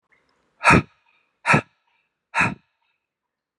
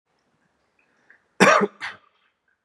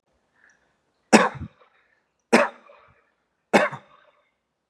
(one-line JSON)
{"exhalation_length": "3.6 s", "exhalation_amplitude": 29613, "exhalation_signal_mean_std_ratio": 0.28, "cough_length": "2.6 s", "cough_amplitude": 31781, "cough_signal_mean_std_ratio": 0.26, "three_cough_length": "4.7 s", "three_cough_amplitude": 32766, "three_cough_signal_mean_std_ratio": 0.24, "survey_phase": "beta (2021-08-13 to 2022-03-07)", "age": "18-44", "gender": "Male", "wearing_mask": "No", "symptom_runny_or_blocked_nose": true, "symptom_onset": "4 days", "smoker_status": "Never smoked", "respiratory_condition_asthma": false, "respiratory_condition_other": false, "recruitment_source": "REACT", "submission_delay": "2 days", "covid_test_result": "Negative", "covid_test_method": "RT-qPCR"}